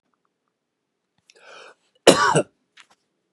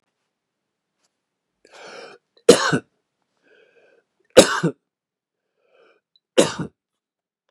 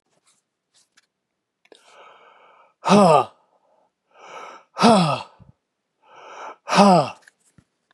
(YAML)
cough_length: 3.3 s
cough_amplitude: 32768
cough_signal_mean_std_ratio: 0.23
three_cough_length: 7.5 s
three_cough_amplitude: 32768
three_cough_signal_mean_std_ratio: 0.2
exhalation_length: 7.9 s
exhalation_amplitude: 30565
exhalation_signal_mean_std_ratio: 0.31
survey_phase: beta (2021-08-13 to 2022-03-07)
age: 45-64
gender: Male
wearing_mask: 'No'
symptom_cough_any: true
symptom_onset: 2 days
smoker_status: Ex-smoker
respiratory_condition_asthma: false
respiratory_condition_other: false
recruitment_source: Test and Trace
submission_delay: 1 day
covid_test_result: Positive
covid_test_method: LAMP